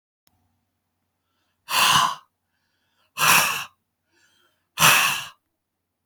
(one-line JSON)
{"exhalation_length": "6.1 s", "exhalation_amplitude": 28107, "exhalation_signal_mean_std_ratio": 0.36, "survey_phase": "beta (2021-08-13 to 2022-03-07)", "age": "65+", "gender": "Male", "wearing_mask": "No", "symptom_none": true, "smoker_status": "Never smoked", "respiratory_condition_asthma": false, "respiratory_condition_other": false, "recruitment_source": "REACT", "submission_delay": "5 days", "covid_test_result": "Negative", "covid_test_method": "RT-qPCR", "influenza_a_test_result": "Negative", "influenza_b_test_result": "Negative"}